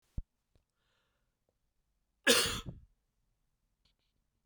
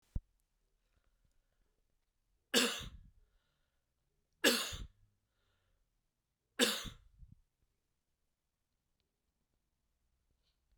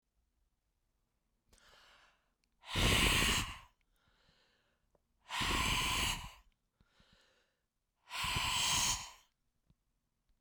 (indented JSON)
{
  "cough_length": "4.5 s",
  "cough_amplitude": 8643,
  "cough_signal_mean_std_ratio": 0.21,
  "three_cough_length": "10.8 s",
  "three_cough_amplitude": 5588,
  "three_cough_signal_mean_std_ratio": 0.22,
  "exhalation_length": "10.4 s",
  "exhalation_amplitude": 4162,
  "exhalation_signal_mean_std_ratio": 0.43,
  "survey_phase": "beta (2021-08-13 to 2022-03-07)",
  "age": "65+",
  "gender": "Male",
  "wearing_mask": "No",
  "symptom_cough_any": true,
  "symptom_change_to_sense_of_smell_or_taste": true,
  "symptom_other": true,
  "symptom_onset": "7 days",
  "smoker_status": "Ex-smoker",
  "respiratory_condition_asthma": false,
  "respiratory_condition_other": false,
  "recruitment_source": "Test and Trace",
  "submission_delay": "2 days",
  "covid_test_result": "Positive",
  "covid_test_method": "RT-qPCR"
}